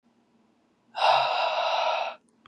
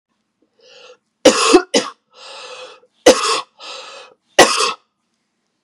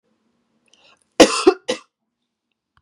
exhalation_length: 2.5 s
exhalation_amplitude: 10383
exhalation_signal_mean_std_ratio: 0.6
three_cough_length: 5.6 s
three_cough_amplitude: 32768
three_cough_signal_mean_std_ratio: 0.34
cough_length: 2.8 s
cough_amplitude: 32768
cough_signal_mean_std_ratio: 0.23
survey_phase: beta (2021-08-13 to 2022-03-07)
age: 18-44
gender: Female
wearing_mask: 'No'
symptom_runny_or_blocked_nose: true
symptom_shortness_of_breath: true
symptom_sore_throat: true
symptom_fatigue: true
symptom_headache: true
symptom_other: true
symptom_onset: 3 days
smoker_status: Ex-smoker
respiratory_condition_asthma: false
respiratory_condition_other: false
recruitment_source: Test and Trace
submission_delay: 2 days
covid_test_result: Positive
covid_test_method: RT-qPCR
covid_ct_value: 27.8
covid_ct_gene: N gene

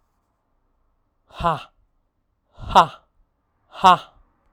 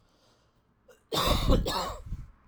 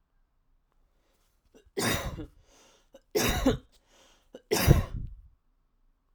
exhalation_length: 4.5 s
exhalation_amplitude: 32768
exhalation_signal_mean_std_ratio: 0.22
cough_length: 2.5 s
cough_amplitude: 9671
cough_signal_mean_std_ratio: 0.5
three_cough_length: 6.1 s
three_cough_amplitude: 16158
three_cough_signal_mean_std_ratio: 0.34
survey_phase: alpha (2021-03-01 to 2021-08-12)
age: 18-44
gender: Male
wearing_mask: 'No'
symptom_none: true
smoker_status: Never smoked
respiratory_condition_asthma: false
respiratory_condition_other: false
recruitment_source: Test and Trace
submission_delay: 1 day
covid_test_result: Negative
covid_test_method: LFT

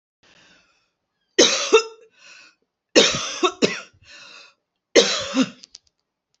three_cough_length: 6.4 s
three_cough_amplitude: 31210
three_cough_signal_mean_std_ratio: 0.35
survey_phase: alpha (2021-03-01 to 2021-08-12)
age: 65+
gender: Female
wearing_mask: 'No'
symptom_none: true
smoker_status: Never smoked
respiratory_condition_asthma: false
respiratory_condition_other: false
recruitment_source: REACT
submission_delay: 2 days
covid_test_result: Negative
covid_test_method: RT-qPCR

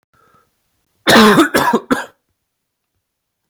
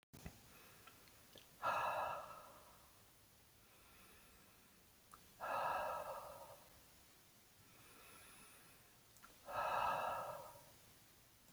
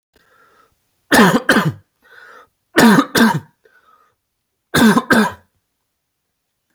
cough_length: 3.5 s
cough_amplitude: 32767
cough_signal_mean_std_ratio: 0.38
exhalation_length: 11.5 s
exhalation_amplitude: 1231
exhalation_signal_mean_std_ratio: 0.51
three_cough_length: 6.7 s
three_cough_amplitude: 32767
three_cough_signal_mean_std_ratio: 0.39
survey_phase: alpha (2021-03-01 to 2021-08-12)
age: 18-44
gender: Male
wearing_mask: 'No'
symptom_none: true
symptom_onset: 4 days
smoker_status: Never smoked
respiratory_condition_asthma: false
respiratory_condition_other: false
recruitment_source: REACT
submission_delay: 1 day
covid_test_result: Negative
covid_test_method: RT-qPCR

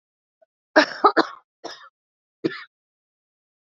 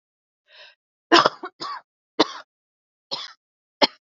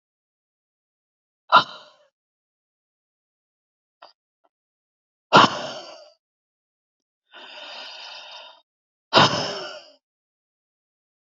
cough_length: 3.7 s
cough_amplitude: 27733
cough_signal_mean_std_ratio: 0.23
three_cough_length: 4.0 s
three_cough_amplitude: 29093
three_cough_signal_mean_std_ratio: 0.24
exhalation_length: 11.3 s
exhalation_amplitude: 32768
exhalation_signal_mean_std_ratio: 0.21
survey_phase: beta (2021-08-13 to 2022-03-07)
age: 18-44
gender: Female
wearing_mask: 'No'
symptom_cough_any: true
symptom_runny_or_blocked_nose: true
symptom_sore_throat: true
symptom_fatigue: true
symptom_headache: true
symptom_onset: 6 days
smoker_status: Current smoker (11 or more cigarettes per day)
respiratory_condition_asthma: true
respiratory_condition_other: false
recruitment_source: Test and Trace
submission_delay: 3 days
covid_test_result: Negative
covid_test_method: RT-qPCR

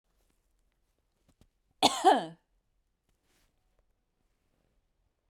cough_length: 5.3 s
cough_amplitude: 14620
cough_signal_mean_std_ratio: 0.19
survey_phase: beta (2021-08-13 to 2022-03-07)
age: 45-64
gender: Female
wearing_mask: 'No'
symptom_none: true
smoker_status: Current smoker (e-cigarettes or vapes only)
respiratory_condition_asthma: false
respiratory_condition_other: false
recruitment_source: REACT
submission_delay: 3 days
covid_test_result: Negative
covid_test_method: RT-qPCR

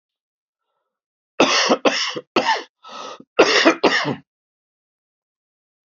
cough_length: 5.9 s
cough_amplitude: 30739
cough_signal_mean_std_ratio: 0.4
survey_phase: beta (2021-08-13 to 2022-03-07)
age: 45-64
gender: Male
wearing_mask: 'No'
symptom_cough_any: true
symptom_runny_or_blocked_nose: true
symptom_fatigue: true
symptom_onset: 3 days
smoker_status: Never smoked
respiratory_condition_asthma: false
respiratory_condition_other: false
recruitment_source: Test and Trace
submission_delay: 2 days
covid_test_result: Positive
covid_test_method: RT-qPCR
covid_ct_value: 17.9
covid_ct_gene: ORF1ab gene
covid_ct_mean: 18.5
covid_viral_load: 850000 copies/ml
covid_viral_load_category: Low viral load (10K-1M copies/ml)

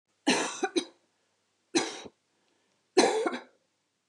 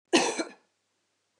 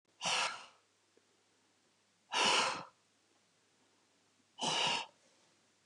three_cough_length: 4.1 s
three_cough_amplitude: 13086
three_cough_signal_mean_std_ratio: 0.37
cough_length: 1.4 s
cough_amplitude: 12657
cough_signal_mean_std_ratio: 0.34
exhalation_length: 5.9 s
exhalation_amplitude: 4611
exhalation_signal_mean_std_ratio: 0.39
survey_phase: beta (2021-08-13 to 2022-03-07)
age: 45-64
gender: Female
wearing_mask: 'No'
symptom_none: true
smoker_status: Never smoked
respiratory_condition_asthma: false
respiratory_condition_other: false
recruitment_source: REACT
submission_delay: 2 days
covid_test_result: Negative
covid_test_method: RT-qPCR
influenza_a_test_result: Negative
influenza_b_test_result: Negative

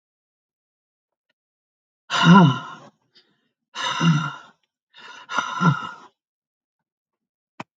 exhalation_length: 7.8 s
exhalation_amplitude: 27143
exhalation_signal_mean_std_ratio: 0.31
survey_phase: alpha (2021-03-01 to 2021-08-12)
age: 65+
gender: Female
wearing_mask: 'No'
symptom_none: true
smoker_status: Ex-smoker
respiratory_condition_asthma: false
respiratory_condition_other: false
recruitment_source: REACT
submission_delay: 2 days
covid_test_result: Negative
covid_test_method: RT-qPCR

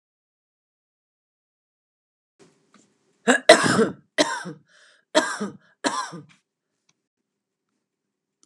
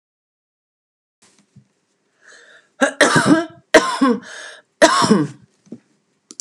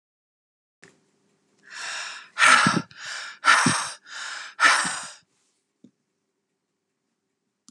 cough_length: 8.5 s
cough_amplitude: 32765
cough_signal_mean_std_ratio: 0.25
three_cough_length: 6.4 s
three_cough_amplitude: 32768
three_cough_signal_mean_std_ratio: 0.37
exhalation_length: 7.7 s
exhalation_amplitude: 23465
exhalation_signal_mean_std_ratio: 0.36
survey_phase: alpha (2021-03-01 to 2021-08-12)
age: 45-64
gender: Female
wearing_mask: 'No'
symptom_none: true
smoker_status: Ex-smoker
respiratory_condition_asthma: false
respiratory_condition_other: false
recruitment_source: REACT
submission_delay: 1 day
covid_test_result: Negative
covid_test_method: RT-qPCR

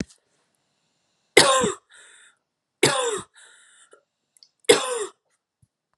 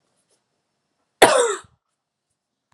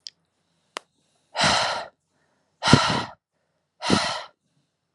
three_cough_length: 6.0 s
three_cough_amplitude: 32767
three_cough_signal_mean_std_ratio: 0.3
cough_length: 2.7 s
cough_amplitude: 32767
cough_signal_mean_std_ratio: 0.25
exhalation_length: 4.9 s
exhalation_amplitude: 32299
exhalation_signal_mean_std_ratio: 0.37
survey_phase: beta (2021-08-13 to 2022-03-07)
age: 18-44
gender: Female
wearing_mask: 'No'
symptom_runny_or_blocked_nose: true
symptom_sore_throat: true
smoker_status: Never smoked
respiratory_condition_asthma: false
respiratory_condition_other: false
recruitment_source: REACT
submission_delay: 0 days
covid_test_result: Negative
covid_test_method: RT-qPCR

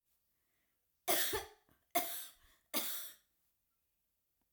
three_cough_length: 4.5 s
three_cough_amplitude: 3537
three_cough_signal_mean_std_ratio: 0.36
survey_phase: alpha (2021-03-01 to 2021-08-12)
age: 65+
gender: Female
wearing_mask: 'No'
symptom_none: true
smoker_status: Never smoked
respiratory_condition_asthma: true
respiratory_condition_other: false
recruitment_source: REACT
submission_delay: 2 days
covid_test_result: Negative
covid_test_method: RT-qPCR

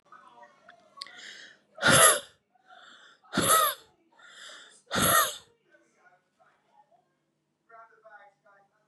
exhalation_length: 8.9 s
exhalation_amplitude: 19783
exhalation_signal_mean_std_ratio: 0.31
survey_phase: beta (2021-08-13 to 2022-03-07)
age: 18-44
gender: Female
wearing_mask: 'No'
symptom_cough_any: true
symptom_new_continuous_cough: true
symptom_runny_or_blocked_nose: true
symptom_sore_throat: true
symptom_fatigue: true
symptom_headache: true
symptom_change_to_sense_of_smell_or_taste: true
symptom_other: true
symptom_onset: 3 days
smoker_status: Never smoked
respiratory_condition_asthma: true
respiratory_condition_other: false
recruitment_source: Test and Trace
submission_delay: 1 day
covid_test_result: Positive
covid_test_method: RT-qPCR
covid_ct_value: 19.9
covid_ct_gene: N gene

